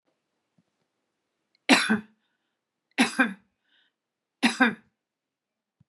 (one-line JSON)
{"three_cough_length": "5.9 s", "three_cough_amplitude": 24317, "three_cough_signal_mean_std_ratio": 0.27, "survey_phase": "beta (2021-08-13 to 2022-03-07)", "age": "65+", "gender": "Female", "wearing_mask": "Yes", "symptom_sore_throat": true, "symptom_onset": "12 days", "smoker_status": "Ex-smoker", "respiratory_condition_asthma": false, "respiratory_condition_other": false, "recruitment_source": "REACT", "submission_delay": "2 days", "covid_test_result": "Negative", "covid_test_method": "RT-qPCR", "influenza_a_test_result": "Negative", "influenza_b_test_result": "Negative"}